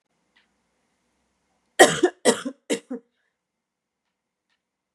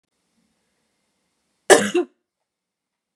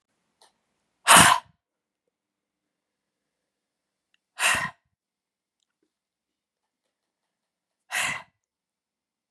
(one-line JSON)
{"three_cough_length": "4.9 s", "three_cough_amplitude": 32767, "three_cough_signal_mean_std_ratio": 0.21, "cough_length": "3.2 s", "cough_amplitude": 32768, "cough_signal_mean_std_ratio": 0.2, "exhalation_length": "9.3 s", "exhalation_amplitude": 32583, "exhalation_signal_mean_std_ratio": 0.2, "survey_phase": "beta (2021-08-13 to 2022-03-07)", "age": "18-44", "gender": "Female", "wearing_mask": "No", "symptom_cough_any": true, "symptom_runny_or_blocked_nose": true, "symptom_fatigue": true, "symptom_headache": true, "symptom_other": true, "smoker_status": "Never smoked", "respiratory_condition_asthma": true, "respiratory_condition_other": false, "recruitment_source": "Test and Trace", "submission_delay": "2 days", "covid_test_result": "Positive", "covid_test_method": "RT-qPCR", "covid_ct_value": 18.4, "covid_ct_gene": "ORF1ab gene"}